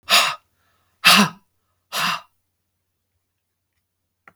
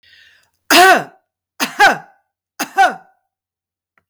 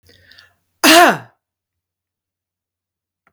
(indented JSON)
{
  "exhalation_length": "4.4 s",
  "exhalation_amplitude": 32768,
  "exhalation_signal_mean_std_ratio": 0.3,
  "three_cough_length": "4.1 s",
  "three_cough_amplitude": 32768,
  "three_cough_signal_mean_std_ratio": 0.35,
  "cough_length": "3.3 s",
  "cough_amplitude": 32766,
  "cough_signal_mean_std_ratio": 0.26,
  "survey_phase": "beta (2021-08-13 to 2022-03-07)",
  "age": "65+",
  "gender": "Female",
  "wearing_mask": "No",
  "symptom_none": true,
  "smoker_status": "Never smoked",
  "respiratory_condition_asthma": false,
  "respiratory_condition_other": false,
  "recruitment_source": "REACT",
  "submission_delay": "1 day",
  "covid_test_result": "Negative",
  "covid_test_method": "RT-qPCR"
}